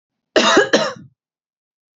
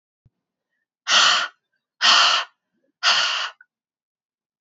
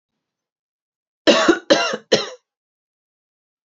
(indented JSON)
{
  "cough_length": "2.0 s",
  "cough_amplitude": 30340,
  "cough_signal_mean_std_ratio": 0.41,
  "exhalation_length": "4.6 s",
  "exhalation_amplitude": 24929,
  "exhalation_signal_mean_std_ratio": 0.42,
  "three_cough_length": "3.8 s",
  "three_cough_amplitude": 32594,
  "three_cough_signal_mean_std_ratio": 0.31,
  "survey_phase": "beta (2021-08-13 to 2022-03-07)",
  "age": "18-44",
  "gender": "Female",
  "wearing_mask": "No",
  "symptom_runny_or_blocked_nose": true,
  "symptom_sore_throat": true,
  "smoker_status": "Ex-smoker",
  "respiratory_condition_asthma": false,
  "respiratory_condition_other": false,
  "recruitment_source": "REACT",
  "submission_delay": "3 days",
  "covid_test_result": "Negative",
  "covid_test_method": "RT-qPCR"
}